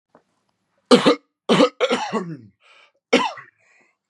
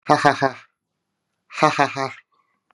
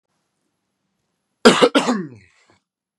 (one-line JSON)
{"three_cough_length": "4.1 s", "three_cough_amplitude": 32767, "three_cough_signal_mean_std_ratio": 0.37, "exhalation_length": "2.7 s", "exhalation_amplitude": 32767, "exhalation_signal_mean_std_ratio": 0.34, "cough_length": "3.0 s", "cough_amplitude": 32768, "cough_signal_mean_std_ratio": 0.29, "survey_phase": "beta (2021-08-13 to 2022-03-07)", "age": "18-44", "gender": "Male", "wearing_mask": "No", "symptom_none": true, "smoker_status": "Current smoker (1 to 10 cigarettes per day)", "respiratory_condition_asthma": false, "respiratory_condition_other": false, "recruitment_source": "REACT", "submission_delay": "0 days", "covid_test_result": "Negative", "covid_test_method": "RT-qPCR"}